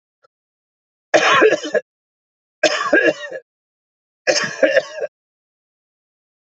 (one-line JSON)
{"three_cough_length": "6.5 s", "three_cough_amplitude": 29596, "three_cough_signal_mean_std_ratio": 0.39, "survey_phase": "beta (2021-08-13 to 2022-03-07)", "age": "45-64", "gender": "Male", "wearing_mask": "No", "symptom_none": true, "symptom_onset": "12 days", "smoker_status": "Never smoked", "respiratory_condition_asthma": false, "respiratory_condition_other": false, "recruitment_source": "REACT", "submission_delay": "1 day", "covid_test_result": "Negative", "covid_test_method": "RT-qPCR", "influenza_a_test_result": "Negative", "influenza_b_test_result": "Negative"}